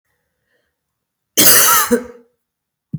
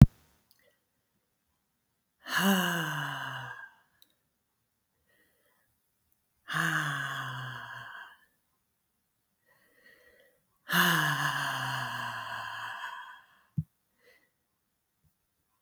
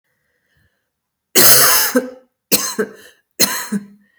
cough_length: 3.0 s
cough_amplitude: 32768
cough_signal_mean_std_ratio: 0.37
exhalation_length: 15.6 s
exhalation_amplitude: 26092
exhalation_signal_mean_std_ratio: 0.34
three_cough_length: 4.2 s
three_cough_amplitude: 32768
three_cough_signal_mean_std_ratio: 0.42
survey_phase: beta (2021-08-13 to 2022-03-07)
age: 45-64
gender: Female
wearing_mask: 'No'
symptom_cough_any: true
symptom_sore_throat: true
symptom_fatigue: true
symptom_onset: 3 days
smoker_status: Ex-smoker
respiratory_condition_asthma: false
respiratory_condition_other: false
recruitment_source: Test and Trace
submission_delay: 1 day
covid_test_result: Positive
covid_test_method: RT-qPCR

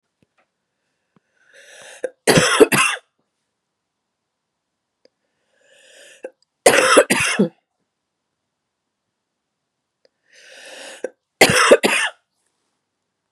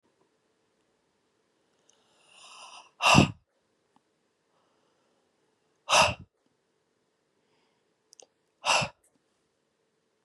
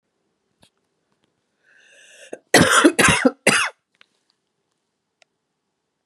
three_cough_length: 13.3 s
three_cough_amplitude: 32768
three_cough_signal_mean_std_ratio: 0.29
exhalation_length: 10.2 s
exhalation_amplitude: 20906
exhalation_signal_mean_std_ratio: 0.21
cough_length: 6.1 s
cough_amplitude: 32768
cough_signal_mean_std_ratio: 0.3
survey_phase: beta (2021-08-13 to 2022-03-07)
age: 45-64
gender: Female
wearing_mask: 'No'
symptom_cough_any: true
symptom_sore_throat: true
symptom_onset: 3 days
smoker_status: Never smoked
respiratory_condition_asthma: false
respiratory_condition_other: false
recruitment_source: Test and Trace
submission_delay: 2 days
covid_test_result: Positive
covid_test_method: RT-qPCR
covid_ct_value: 23.2
covid_ct_gene: ORF1ab gene
covid_ct_mean: 24.3
covid_viral_load: 11000 copies/ml
covid_viral_load_category: Low viral load (10K-1M copies/ml)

